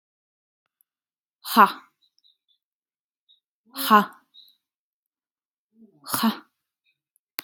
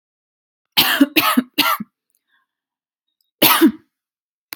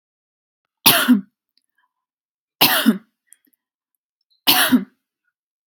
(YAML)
exhalation_length: 7.4 s
exhalation_amplitude: 28609
exhalation_signal_mean_std_ratio: 0.2
cough_length: 4.6 s
cough_amplitude: 32768
cough_signal_mean_std_ratio: 0.37
three_cough_length: 5.7 s
three_cough_amplitude: 32768
three_cough_signal_mean_std_ratio: 0.32
survey_phase: alpha (2021-03-01 to 2021-08-12)
age: 18-44
gender: Female
wearing_mask: 'No'
symptom_none: true
symptom_onset: 7 days
smoker_status: Never smoked
respiratory_condition_asthma: false
respiratory_condition_other: false
recruitment_source: REACT
submission_delay: 2 days
covid_test_result: Negative
covid_test_method: RT-qPCR